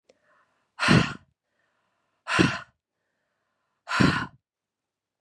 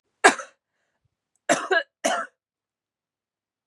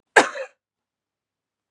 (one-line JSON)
{"exhalation_length": "5.2 s", "exhalation_amplitude": 18749, "exhalation_signal_mean_std_ratio": 0.31, "three_cough_length": "3.7 s", "three_cough_amplitude": 30839, "three_cough_signal_mean_std_ratio": 0.27, "cough_length": "1.7 s", "cough_amplitude": 32747, "cough_signal_mean_std_ratio": 0.2, "survey_phase": "beta (2021-08-13 to 2022-03-07)", "age": "18-44", "gender": "Female", "wearing_mask": "No", "symptom_cough_any": true, "symptom_runny_or_blocked_nose": true, "smoker_status": "Never smoked", "respiratory_condition_asthma": false, "respiratory_condition_other": false, "recruitment_source": "Test and Trace", "submission_delay": "1 day", "covid_test_result": "Positive", "covid_test_method": "RT-qPCR", "covid_ct_value": 18.9, "covid_ct_gene": "N gene", "covid_ct_mean": 19.3, "covid_viral_load": "470000 copies/ml", "covid_viral_load_category": "Low viral load (10K-1M copies/ml)"}